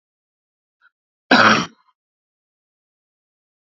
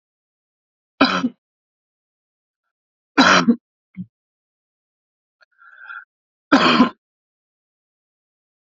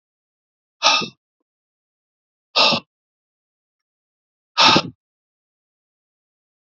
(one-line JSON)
{"cough_length": "3.8 s", "cough_amplitude": 32768, "cough_signal_mean_std_ratio": 0.23, "three_cough_length": "8.6 s", "three_cough_amplitude": 32115, "three_cough_signal_mean_std_ratio": 0.27, "exhalation_length": "6.7 s", "exhalation_amplitude": 32767, "exhalation_signal_mean_std_ratio": 0.25, "survey_phase": "beta (2021-08-13 to 2022-03-07)", "age": "45-64", "gender": "Male", "wearing_mask": "No", "symptom_cough_any": true, "symptom_runny_or_blocked_nose": true, "symptom_change_to_sense_of_smell_or_taste": true, "symptom_loss_of_taste": true, "symptom_other": true, "symptom_onset": "4 days", "smoker_status": "Never smoked", "respiratory_condition_asthma": false, "respiratory_condition_other": false, "recruitment_source": "Test and Trace", "submission_delay": "2 days", "covid_test_result": "Positive", "covid_test_method": "RT-qPCR", "covid_ct_value": 20.3, "covid_ct_gene": "ORF1ab gene"}